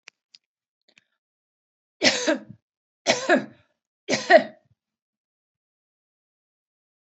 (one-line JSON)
{"three_cough_length": "7.1 s", "three_cough_amplitude": 27280, "three_cough_signal_mean_std_ratio": 0.25, "survey_phase": "beta (2021-08-13 to 2022-03-07)", "age": "45-64", "gender": "Female", "wearing_mask": "No", "symptom_none": true, "smoker_status": "Never smoked", "respiratory_condition_asthma": false, "respiratory_condition_other": false, "recruitment_source": "REACT", "submission_delay": "2 days", "covid_test_result": "Negative", "covid_test_method": "RT-qPCR", "influenza_a_test_result": "Negative", "influenza_b_test_result": "Negative"}